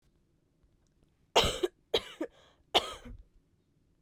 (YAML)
three_cough_length: 4.0 s
three_cough_amplitude: 10085
three_cough_signal_mean_std_ratio: 0.28
survey_phase: beta (2021-08-13 to 2022-03-07)
age: 18-44
gender: Female
wearing_mask: 'No'
symptom_cough_any: true
symptom_shortness_of_breath: true
symptom_fatigue: true
symptom_headache: true
smoker_status: Current smoker (1 to 10 cigarettes per day)
respiratory_condition_asthma: false
respiratory_condition_other: false
recruitment_source: Test and Trace
submission_delay: 1 day
covid_test_result: Positive
covid_test_method: LFT